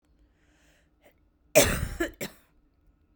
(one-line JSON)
{"cough_length": "3.2 s", "cough_amplitude": 18046, "cough_signal_mean_std_ratio": 0.27, "survey_phase": "beta (2021-08-13 to 2022-03-07)", "age": "18-44", "gender": "Female", "wearing_mask": "Yes", "symptom_fatigue": true, "smoker_status": "Ex-smoker", "respiratory_condition_asthma": false, "respiratory_condition_other": false, "recruitment_source": "Test and Trace", "submission_delay": "3 days", "covid_test_result": "Positive", "covid_test_method": "RT-qPCR", "covid_ct_value": 22.2, "covid_ct_gene": "ORF1ab gene"}